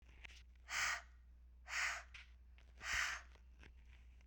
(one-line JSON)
{"exhalation_length": "4.3 s", "exhalation_amplitude": 1484, "exhalation_signal_mean_std_ratio": 0.56, "survey_phase": "beta (2021-08-13 to 2022-03-07)", "age": "18-44", "gender": "Female", "wearing_mask": "No", "symptom_cough_any": true, "symptom_runny_or_blocked_nose": true, "symptom_shortness_of_breath": true, "symptom_sore_throat": true, "symptom_fatigue": true, "symptom_headache": true, "symptom_change_to_sense_of_smell_or_taste": true, "symptom_onset": "5 days", "smoker_status": "Current smoker (1 to 10 cigarettes per day)", "respiratory_condition_asthma": false, "respiratory_condition_other": false, "recruitment_source": "Test and Trace", "submission_delay": "2 days", "covid_test_result": "Positive", "covid_test_method": "RT-qPCR", "covid_ct_value": 24.6, "covid_ct_gene": "ORF1ab gene", "covid_ct_mean": 25.1, "covid_viral_load": "5700 copies/ml", "covid_viral_load_category": "Minimal viral load (< 10K copies/ml)"}